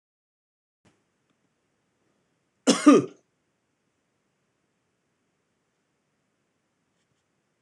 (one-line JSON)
{"cough_length": "7.6 s", "cough_amplitude": 21656, "cough_signal_mean_std_ratio": 0.15, "survey_phase": "beta (2021-08-13 to 2022-03-07)", "age": "45-64", "gender": "Male", "wearing_mask": "No", "symptom_none": true, "symptom_onset": "8 days", "smoker_status": "Never smoked", "respiratory_condition_asthma": false, "respiratory_condition_other": false, "recruitment_source": "REACT", "submission_delay": "1 day", "covid_test_result": "Negative", "covid_test_method": "RT-qPCR"}